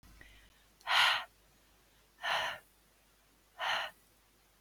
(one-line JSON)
{"exhalation_length": "4.6 s", "exhalation_amplitude": 6141, "exhalation_signal_mean_std_ratio": 0.37, "survey_phase": "beta (2021-08-13 to 2022-03-07)", "age": "18-44", "gender": "Female", "wearing_mask": "No", "symptom_cough_any": true, "symptom_onset": "4 days", "smoker_status": "Never smoked", "respiratory_condition_asthma": true, "respiratory_condition_other": false, "recruitment_source": "REACT", "submission_delay": "4 days", "covid_test_result": "Negative", "covid_test_method": "RT-qPCR"}